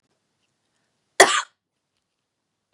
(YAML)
cough_length: 2.7 s
cough_amplitude: 32768
cough_signal_mean_std_ratio: 0.18
survey_phase: beta (2021-08-13 to 2022-03-07)
age: 18-44
gender: Female
wearing_mask: 'No'
symptom_cough_any: true
symptom_runny_or_blocked_nose: true
symptom_sore_throat: true
symptom_fatigue: true
symptom_other: true
symptom_onset: 3 days
smoker_status: Never smoked
respiratory_condition_asthma: false
respiratory_condition_other: false
recruitment_source: Test and Trace
submission_delay: 2 days
covid_test_result: Positive
covid_test_method: RT-qPCR